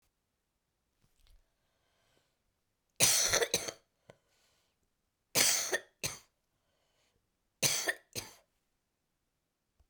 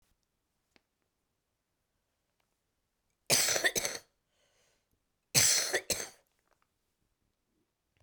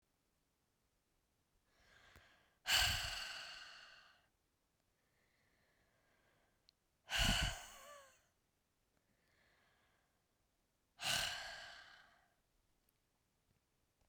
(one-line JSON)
{"three_cough_length": "9.9 s", "three_cough_amplitude": 15531, "three_cough_signal_mean_std_ratio": 0.29, "cough_length": "8.0 s", "cough_amplitude": 11427, "cough_signal_mean_std_ratio": 0.28, "exhalation_length": "14.1 s", "exhalation_amplitude": 3137, "exhalation_signal_mean_std_ratio": 0.3, "survey_phase": "beta (2021-08-13 to 2022-03-07)", "age": "45-64", "gender": "Female", "wearing_mask": "No", "symptom_cough_any": true, "symptom_sore_throat": true, "symptom_onset": "9 days", "smoker_status": "Current smoker (11 or more cigarettes per day)", "respiratory_condition_asthma": false, "respiratory_condition_other": false, "recruitment_source": "REACT", "submission_delay": "1 day", "covid_test_result": "Negative", "covid_test_method": "RT-qPCR"}